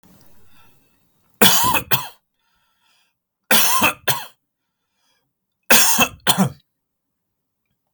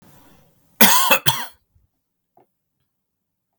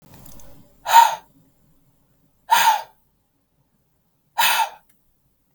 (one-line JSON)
{"three_cough_length": "7.9 s", "three_cough_amplitude": 32768, "three_cough_signal_mean_std_ratio": 0.37, "cough_length": "3.6 s", "cough_amplitude": 32768, "cough_signal_mean_std_ratio": 0.29, "exhalation_length": "5.5 s", "exhalation_amplitude": 32768, "exhalation_signal_mean_std_ratio": 0.31, "survey_phase": "beta (2021-08-13 to 2022-03-07)", "age": "18-44", "gender": "Male", "wearing_mask": "No", "symptom_cough_any": true, "symptom_sore_throat": true, "symptom_onset": "13 days", "smoker_status": "Never smoked", "respiratory_condition_asthma": false, "respiratory_condition_other": false, "recruitment_source": "REACT", "submission_delay": "2 days", "covid_test_result": "Negative", "covid_test_method": "RT-qPCR", "influenza_a_test_result": "Negative", "influenza_b_test_result": "Negative"}